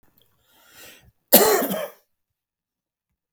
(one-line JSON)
{"cough_length": "3.3 s", "cough_amplitude": 32768, "cough_signal_mean_std_ratio": 0.28, "survey_phase": "beta (2021-08-13 to 2022-03-07)", "age": "65+", "gender": "Male", "wearing_mask": "No", "symptom_none": true, "smoker_status": "Never smoked", "respiratory_condition_asthma": false, "respiratory_condition_other": false, "recruitment_source": "REACT", "submission_delay": "0 days", "covid_test_result": "Negative", "covid_test_method": "RT-qPCR", "influenza_a_test_result": "Negative", "influenza_b_test_result": "Negative"}